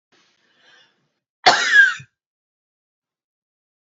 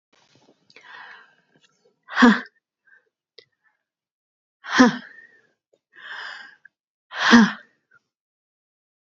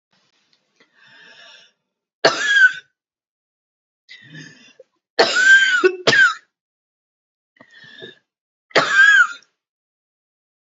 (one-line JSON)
{"cough_length": "3.8 s", "cough_amplitude": 28121, "cough_signal_mean_std_ratio": 0.27, "exhalation_length": "9.1 s", "exhalation_amplitude": 28809, "exhalation_signal_mean_std_ratio": 0.24, "three_cough_length": "10.7 s", "three_cough_amplitude": 30406, "three_cough_signal_mean_std_ratio": 0.36, "survey_phase": "beta (2021-08-13 to 2022-03-07)", "age": "18-44", "gender": "Female", "wearing_mask": "No", "symptom_cough_any": true, "symptom_runny_or_blocked_nose": true, "symptom_sore_throat": true, "symptom_headache": true, "symptom_change_to_sense_of_smell_or_taste": true, "smoker_status": "Never smoked", "respiratory_condition_asthma": false, "respiratory_condition_other": false, "recruitment_source": "Test and Trace", "submission_delay": "1 day", "covid_test_result": "Positive", "covid_test_method": "RT-qPCR", "covid_ct_value": 25.1, "covid_ct_gene": "N gene", "covid_ct_mean": 25.2, "covid_viral_load": "5400 copies/ml", "covid_viral_load_category": "Minimal viral load (< 10K copies/ml)"}